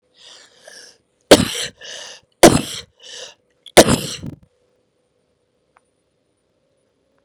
{
  "three_cough_length": "7.2 s",
  "three_cough_amplitude": 32768,
  "three_cough_signal_mean_std_ratio": 0.22,
  "survey_phase": "beta (2021-08-13 to 2022-03-07)",
  "age": "45-64",
  "gender": "Female",
  "wearing_mask": "No",
  "symptom_none": true,
  "smoker_status": "Ex-smoker",
  "respiratory_condition_asthma": false,
  "respiratory_condition_other": false,
  "recruitment_source": "REACT",
  "submission_delay": "1 day",
  "covid_test_result": "Negative",
  "covid_test_method": "RT-qPCR",
  "influenza_a_test_result": "Negative",
  "influenza_b_test_result": "Negative"
}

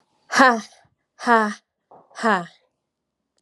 {
  "exhalation_length": "3.4 s",
  "exhalation_amplitude": 32650,
  "exhalation_signal_mean_std_ratio": 0.33,
  "survey_phase": "alpha (2021-03-01 to 2021-08-12)",
  "age": "45-64",
  "gender": "Female",
  "wearing_mask": "No",
  "symptom_fatigue": true,
  "smoker_status": "Never smoked",
  "respiratory_condition_asthma": false,
  "respiratory_condition_other": false,
  "recruitment_source": "Test and Trace",
  "submission_delay": "0 days",
  "covid_test_result": "Negative",
  "covid_test_method": "LFT"
}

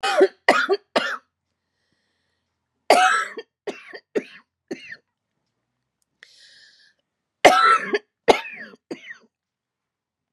{
  "three_cough_length": "10.3 s",
  "three_cough_amplitude": 32768,
  "three_cough_signal_mean_std_ratio": 0.32,
  "survey_phase": "beta (2021-08-13 to 2022-03-07)",
  "age": "45-64",
  "gender": "Female",
  "wearing_mask": "No",
  "symptom_shortness_of_breath": true,
  "symptom_diarrhoea": true,
  "symptom_fatigue": true,
  "symptom_headache": true,
  "symptom_change_to_sense_of_smell_or_taste": true,
  "symptom_loss_of_taste": true,
  "symptom_onset": "382 days",
  "smoker_status": "Never smoked",
  "respiratory_condition_asthma": true,
  "respiratory_condition_other": false,
  "recruitment_source": "Test and Trace",
  "submission_delay": "3 days",
  "covid_test_result": "Negative",
  "covid_test_method": "RT-qPCR"
}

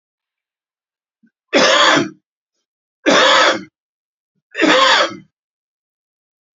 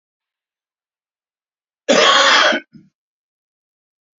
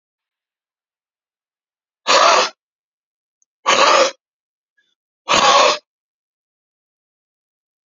{
  "three_cough_length": "6.6 s",
  "three_cough_amplitude": 32767,
  "three_cough_signal_mean_std_ratio": 0.42,
  "cough_length": "4.2 s",
  "cough_amplitude": 31614,
  "cough_signal_mean_std_ratio": 0.34,
  "exhalation_length": "7.9 s",
  "exhalation_amplitude": 31684,
  "exhalation_signal_mean_std_ratio": 0.33,
  "survey_phase": "beta (2021-08-13 to 2022-03-07)",
  "age": "65+",
  "gender": "Male",
  "wearing_mask": "No",
  "symptom_cough_any": true,
  "smoker_status": "Current smoker (11 or more cigarettes per day)",
  "respiratory_condition_asthma": false,
  "respiratory_condition_other": false,
  "recruitment_source": "REACT",
  "submission_delay": "4 days",
  "covid_test_result": "Negative",
  "covid_test_method": "RT-qPCR",
  "influenza_a_test_result": "Negative",
  "influenza_b_test_result": "Negative"
}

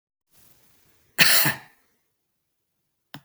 {
  "cough_length": "3.2 s",
  "cough_amplitude": 32768,
  "cough_signal_mean_std_ratio": 0.26,
  "survey_phase": "beta (2021-08-13 to 2022-03-07)",
  "age": "45-64",
  "gender": "Male",
  "wearing_mask": "No",
  "symptom_none": true,
  "smoker_status": "Never smoked",
  "respiratory_condition_asthma": false,
  "respiratory_condition_other": false,
  "recruitment_source": "REACT",
  "submission_delay": "1 day",
  "covid_test_result": "Negative",
  "covid_test_method": "RT-qPCR",
  "influenza_a_test_result": "Negative",
  "influenza_b_test_result": "Negative"
}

